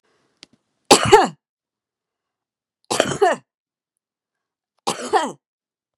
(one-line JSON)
{"three_cough_length": "6.0 s", "three_cough_amplitude": 32768, "three_cough_signal_mean_std_ratio": 0.28, "survey_phase": "beta (2021-08-13 to 2022-03-07)", "age": "45-64", "gender": "Female", "wearing_mask": "No", "symptom_none": true, "smoker_status": "Current smoker (1 to 10 cigarettes per day)", "respiratory_condition_asthma": false, "respiratory_condition_other": false, "recruitment_source": "REACT", "submission_delay": "2 days", "covid_test_result": "Negative", "covid_test_method": "RT-qPCR", "influenza_a_test_result": "Negative", "influenza_b_test_result": "Negative"}